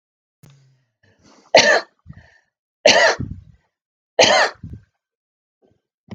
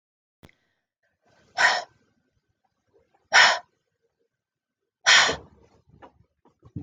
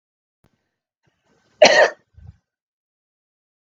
{"three_cough_length": "6.1 s", "three_cough_amplitude": 32768, "three_cough_signal_mean_std_ratio": 0.31, "exhalation_length": "6.8 s", "exhalation_amplitude": 22875, "exhalation_signal_mean_std_ratio": 0.26, "cough_length": "3.7 s", "cough_amplitude": 32768, "cough_signal_mean_std_ratio": 0.21, "survey_phase": "beta (2021-08-13 to 2022-03-07)", "age": "45-64", "gender": "Female", "wearing_mask": "No", "symptom_fatigue": true, "symptom_headache": true, "symptom_change_to_sense_of_smell_or_taste": true, "symptom_onset": "12 days", "smoker_status": "Ex-smoker", "respiratory_condition_asthma": false, "respiratory_condition_other": false, "recruitment_source": "REACT", "submission_delay": "24 days", "covid_test_result": "Negative", "covid_test_method": "RT-qPCR", "influenza_a_test_result": "Negative", "influenza_b_test_result": "Negative"}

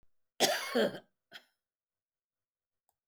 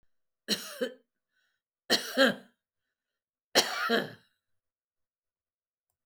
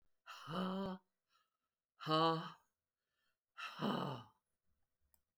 {"cough_length": "3.1 s", "cough_amplitude": 8314, "cough_signal_mean_std_ratio": 0.31, "three_cough_length": "6.1 s", "three_cough_amplitude": 13858, "three_cough_signal_mean_std_ratio": 0.31, "exhalation_length": "5.4 s", "exhalation_amplitude": 2635, "exhalation_signal_mean_std_ratio": 0.41, "survey_phase": "beta (2021-08-13 to 2022-03-07)", "age": "65+", "gender": "Female", "wearing_mask": "No", "symptom_none": true, "symptom_onset": "13 days", "smoker_status": "Ex-smoker", "respiratory_condition_asthma": false, "respiratory_condition_other": false, "recruitment_source": "REACT", "submission_delay": "4 days", "covid_test_result": "Negative", "covid_test_method": "RT-qPCR"}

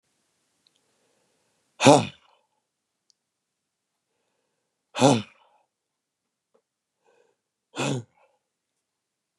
{"exhalation_length": "9.4 s", "exhalation_amplitude": 32161, "exhalation_signal_mean_std_ratio": 0.18, "survey_phase": "beta (2021-08-13 to 2022-03-07)", "age": "18-44", "gender": "Male", "wearing_mask": "No", "symptom_none": true, "smoker_status": "Never smoked", "respiratory_condition_asthma": false, "respiratory_condition_other": false, "recruitment_source": "REACT", "submission_delay": "1 day", "covid_test_result": "Negative", "covid_test_method": "RT-qPCR", "influenza_a_test_result": "Negative", "influenza_b_test_result": "Negative"}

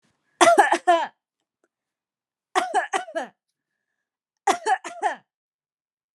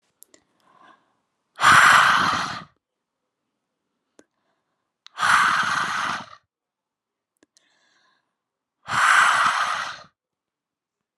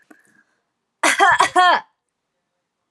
{"three_cough_length": "6.1 s", "three_cough_amplitude": 25597, "three_cough_signal_mean_std_ratio": 0.35, "exhalation_length": "11.2 s", "exhalation_amplitude": 27725, "exhalation_signal_mean_std_ratio": 0.39, "cough_length": "2.9 s", "cough_amplitude": 29794, "cough_signal_mean_std_ratio": 0.39, "survey_phase": "alpha (2021-03-01 to 2021-08-12)", "age": "18-44", "gender": "Female", "wearing_mask": "No", "symptom_none": true, "smoker_status": "Never smoked", "respiratory_condition_asthma": false, "respiratory_condition_other": false, "recruitment_source": "REACT", "submission_delay": "2 days", "covid_test_result": "Negative", "covid_test_method": "RT-qPCR"}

